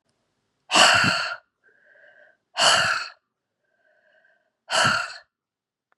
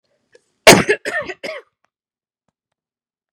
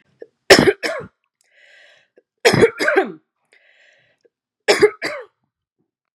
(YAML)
exhalation_length: 6.0 s
exhalation_amplitude: 28111
exhalation_signal_mean_std_ratio: 0.39
cough_length: 3.3 s
cough_amplitude: 32768
cough_signal_mean_std_ratio: 0.24
three_cough_length: 6.1 s
three_cough_amplitude: 32768
three_cough_signal_mean_std_ratio: 0.32
survey_phase: beta (2021-08-13 to 2022-03-07)
age: 45-64
gender: Female
wearing_mask: 'No'
symptom_none: true
smoker_status: Ex-smoker
respiratory_condition_asthma: false
respiratory_condition_other: false
recruitment_source: REACT
submission_delay: 2 days
covid_test_result: Negative
covid_test_method: RT-qPCR